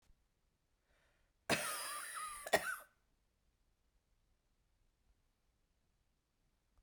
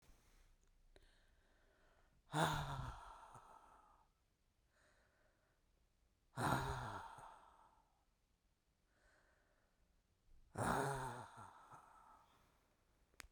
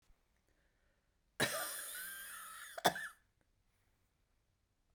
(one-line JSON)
{"cough_length": "6.8 s", "cough_amplitude": 3733, "cough_signal_mean_std_ratio": 0.28, "exhalation_length": "13.3 s", "exhalation_amplitude": 2316, "exhalation_signal_mean_std_ratio": 0.36, "three_cough_length": "4.9 s", "three_cough_amplitude": 4844, "three_cough_signal_mean_std_ratio": 0.34, "survey_phase": "beta (2021-08-13 to 2022-03-07)", "age": "45-64", "gender": "Female", "wearing_mask": "No", "symptom_cough_any": true, "symptom_runny_or_blocked_nose": true, "symptom_fatigue": true, "symptom_change_to_sense_of_smell_or_taste": true, "symptom_loss_of_taste": true, "smoker_status": "Never smoked", "respiratory_condition_asthma": false, "respiratory_condition_other": false, "recruitment_source": "Test and Trace", "submission_delay": "2 days", "covid_test_result": "Positive", "covid_test_method": "RT-qPCR", "covid_ct_value": 18.0, "covid_ct_gene": "N gene", "covid_ct_mean": 18.2, "covid_viral_load": "1000000 copies/ml", "covid_viral_load_category": "High viral load (>1M copies/ml)"}